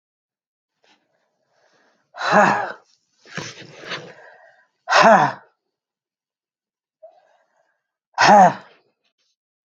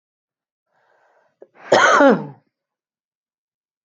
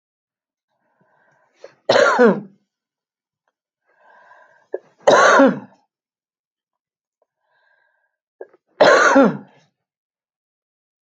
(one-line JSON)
{"exhalation_length": "9.6 s", "exhalation_amplitude": 29554, "exhalation_signal_mean_std_ratio": 0.29, "cough_length": "3.8 s", "cough_amplitude": 28167, "cough_signal_mean_std_ratio": 0.29, "three_cough_length": "11.2 s", "three_cough_amplitude": 31216, "three_cough_signal_mean_std_ratio": 0.3, "survey_phase": "beta (2021-08-13 to 2022-03-07)", "age": "45-64", "gender": "Female", "wearing_mask": "No", "symptom_cough_any": true, "symptom_runny_or_blocked_nose": true, "symptom_sore_throat": true, "symptom_fatigue": true, "symptom_headache": true, "symptom_change_to_sense_of_smell_or_taste": true, "symptom_loss_of_taste": true, "smoker_status": "Ex-smoker", "respiratory_condition_asthma": false, "respiratory_condition_other": true, "recruitment_source": "Test and Trace", "submission_delay": "1 day", "covid_test_result": "Positive", "covid_test_method": "RT-qPCR"}